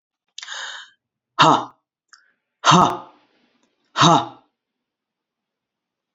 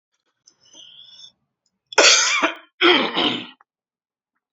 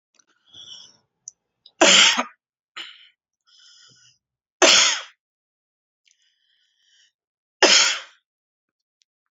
{"exhalation_length": "6.1 s", "exhalation_amplitude": 30949, "exhalation_signal_mean_std_ratio": 0.29, "cough_length": "4.5 s", "cough_amplitude": 31955, "cough_signal_mean_std_ratio": 0.39, "three_cough_length": "9.3 s", "three_cough_amplitude": 31666, "three_cough_signal_mean_std_ratio": 0.28, "survey_phase": "beta (2021-08-13 to 2022-03-07)", "age": "18-44", "gender": "Male", "wearing_mask": "No", "symptom_cough_any": true, "symptom_runny_or_blocked_nose": true, "symptom_sore_throat": true, "smoker_status": "Never smoked", "respiratory_condition_asthma": false, "respiratory_condition_other": false, "recruitment_source": "Test and Trace", "submission_delay": "1 day", "covid_test_result": "Positive", "covid_test_method": "LFT"}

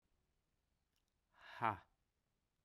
{"exhalation_length": "2.6 s", "exhalation_amplitude": 2504, "exhalation_signal_mean_std_ratio": 0.2, "survey_phase": "beta (2021-08-13 to 2022-03-07)", "age": "45-64", "gender": "Male", "wearing_mask": "No", "symptom_none": true, "smoker_status": "Never smoked", "respiratory_condition_asthma": false, "respiratory_condition_other": false, "recruitment_source": "REACT", "submission_delay": "0 days", "covid_test_result": "Negative", "covid_test_method": "RT-qPCR"}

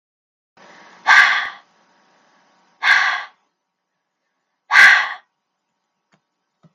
{"exhalation_length": "6.7 s", "exhalation_amplitude": 32768, "exhalation_signal_mean_std_ratio": 0.31, "survey_phase": "beta (2021-08-13 to 2022-03-07)", "age": "45-64", "gender": "Female", "wearing_mask": "No", "symptom_runny_or_blocked_nose": true, "symptom_onset": "12 days", "smoker_status": "Never smoked", "respiratory_condition_asthma": false, "respiratory_condition_other": false, "recruitment_source": "REACT", "submission_delay": "1 day", "covid_test_result": "Negative", "covid_test_method": "RT-qPCR"}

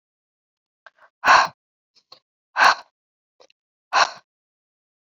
{"exhalation_length": "5.0 s", "exhalation_amplitude": 30353, "exhalation_signal_mean_std_ratio": 0.25, "survey_phase": "beta (2021-08-13 to 2022-03-07)", "age": "18-44", "gender": "Female", "wearing_mask": "No", "symptom_cough_any": true, "symptom_shortness_of_breath": true, "symptom_abdominal_pain": true, "symptom_headache": true, "symptom_loss_of_taste": true, "symptom_onset": "2 days", "smoker_status": "Never smoked", "respiratory_condition_asthma": false, "respiratory_condition_other": false, "recruitment_source": "Test and Trace", "submission_delay": "2 days", "covid_test_result": "Positive", "covid_test_method": "RT-qPCR", "covid_ct_value": 15.1, "covid_ct_gene": "N gene", "covid_ct_mean": 15.2, "covid_viral_load": "10000000 copies/ml", "covid_viral_load_category": "High viral load (>1M copies/ml)"}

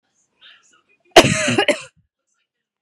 {"cough_length": "2.8 s", "cough_amplitude": 32768, "cough_signal_mean_std_ratio": 0.29, "survey_phase": "beta (2021-08-13 to 2022-03-07)", "age": "18-44", "gender": "Female", "wearing_mask": "No", "symptom_none": true, "smoker_status": "Never smoked", "respiratory_condition_asthma": false, "respiratory_condition_other": false, "recruitment_source": "REACT", "submission_delay": "2 days", "covid_test_result": "Negative", "covid_test_method": "RT-qPCR", "influenza_a_test_result": "Negative", "influenza_b_test_result": "Negative"}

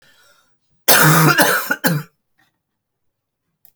{"cough_length": "3.8 s", "cough_amplitude": 32768, "cough_signal_mean_std_ratio": 0.42, "survey_phase": "alpha (2021-03-01 to 2021-08-12)", "age": "45-64", "gender": "Female", "wearing_mask": "No", "symptom_cough_any": true, "symptom_change_to_sense_of_smell_or_taste": true, "symptom_loss_of_taste": true, "symptom_onset": "5 days", "smoker_status": "Never smoked", "respiratory_condition_asthma": true, "respiratory_condition_other": false, "recruitment_source": "Test and Trace", "submission_delay": "1 day", "covid_test_result": "Positive", "covid_test_method": "RT-qPCR"}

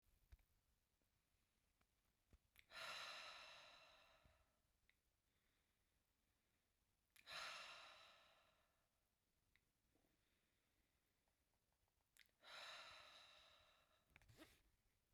{"exhalation_length": "15.1 s", "exhalation_amplitude": 281, "exhalation_signal_mean_std_ratio": 0.43, "survey_phase": "beta (2021-08-13 to 2022-03-07)", "age": "18-44", "gender": "Female", "wearing_mask": "No", "symptom_none": true, "smoker_status": "Current smoker (1 to 10 cigarettes per day)", "respiratory_condition_asthma": false, "respiratory_condition_other": false, "recruitment_source": "REACT", "submission_delay": "2 days", "covid_test_result": "Negative", "covid_test_method": "RT-qPCR"}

